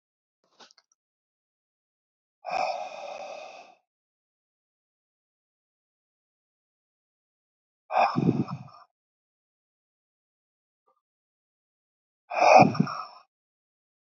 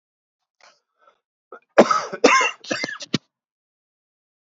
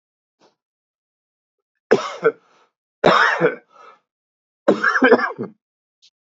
{
  "exhalation_length": "14.1 s",
  "exhalation_amplitude": 21941,
  "exhalation_signal_mean_std_ratio": 0.23,
  "cough_length": "4.4 s",
  "cough_amplitude": 27923,
  "cough_signal_mean_std_ratio": 0.29,
  "three_cough_length": "6.3 s",
  "three_cough_amplitude": 29506,
  "three_cough_signal_mean_std_ratio": 0.35,
  "survey_phase": "beta (2021-08-13 to 2022-03-07)",
  "age": "45-64",
  "gender": "Male",
  "wearing_mask": "No",
  "symptom_none": true,
  "smoker_status": "Never smoked",
  "respiratory_condition_asthma": true,
  "respiratory_condition_other": false,
  "recruitment_source": "REACT",
  "submission_delay": "0 days",
  "covid_test_result": "Negative",
  "covid_test_method": "RT-qPCR"
}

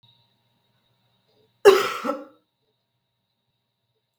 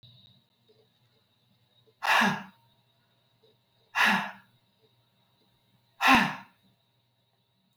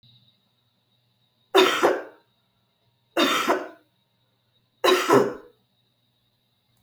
{
  "cough_length": "4.2 s",
  "cough_amplitude": 32766,
  "cough_signal_mean_std_ratio": 0.2,
  "exhalation_length": "7.8 s",
  "exhalation_amplitude": 15309,
  "exhalation_signal_mean_std_ratio": 0.28,
  "three_cough_length": "6.8 s",
  "three_cough_amplitude": 24955,
  "three_cough_signal_mean_std_ratio": 0.35,
  "survey_phase": "beta (2021-08-13 to 2022-03-07)",
  "age": "45-64",
  "gender": "Female",
  "wearing_mask": "No",
  "symptom_cough_any": true,
  "symptom_runny_or_blocked_nose": true,
  "symptom_sore_throat": true,
  "symptom_fatigue": true,
  "symptom_headache": true,
  "symptom_other": true,
  "symptom_onset": "5 days",
  "smoker_status": "Never smoked",
  "respiratory_condition_asthma": false,
  "respiratory_condition_other": false,
  "recruitment_source": "Test and Trace",
  "submission_delay": "1 day",
  "covid_test_result": "Positive",
  "covid_test_method": "RT-qPCR",
  "covid_ct_value": 17.0,
  "covid_ct_gene": "N gene",
  "covid_ct_mean": 17.7,
  "covid_viral_load": "1600000 copies/ml",
  "covid_viral_load_category": "High viral load (>1M copies/ml)"
}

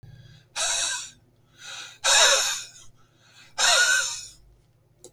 {
  "exhalation_length": "5.1 s",
  "exhalation_amplitude": 18236,
  "exhalation_signal_mean_std_ratio": 0.48,
  "survey_phase": "beta (2021-08-13 to 2022-03-07)",
  "age": "45-64",
  "gender": "Male",
  "wearing_mask": "No",
  "symptom_none": true,
  "smoker_status": "Never smoked",
  "respiratory_condition_asthma": false,
  "respiratory_condition_other": false,
  "recruitment_source": "REACT",
  "submission_delay": "2 days",
  "covid_test_result": "Negative",
  "covid_test_method": "RT-qPCR",
  "influenza_a_test_result": "Negative",
  "influenza_b_test_result": "Negative"
}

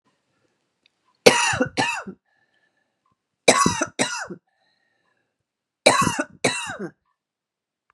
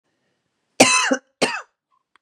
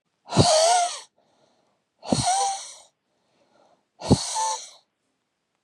{
  "three_cough_length": "7.9 s",
  "three_cough_amplitude": 32768,
  "three_cough_signal_mean_std_ratio": 0.33,
  "cough_length": "2.2 s",
  "cough_amplitude": 32768,
  "cough_signal_mean_std_ratio": 0.35,
  "exhalation_length": "5.6 s",
  "exhalation_amplitude": 25688,
  "exhalation_signal_mean_std_ratio": 0.43,
  "survey_phase": "beta (2021-08-13 to 2022-03-07)",
  "age": "45-64",
  "gender": "Female",
  "wearing_mask": "No",
  "symptom_runny_or_blocked_nose": true,
  "symptom_sore_throat": true,
  "symptom_fatigue": true,
  "symptom_headache": true,
  "symptom_onset": "4 days",
  "smoker_status": "Ex-smoker",
  "respiratory_condition_asthma": false,
  "respiratory_condition_other": false,
  "recruitment_source": "Test and Trace",
  "submission_delay": "2 days",
  "covid_test_result": "Positive",
  "covid_test_method": "RT-qPCR",
  "covid_ct_value": 17.7,
  "covid_ct_gene": "ORF1ab gene",
  "covid_ct_mean": 18.0,
  "covid_viral_load": "1300000 copies/ml",
  "covid_viral_load_category": "High viral load (>1M copies/ml)"
}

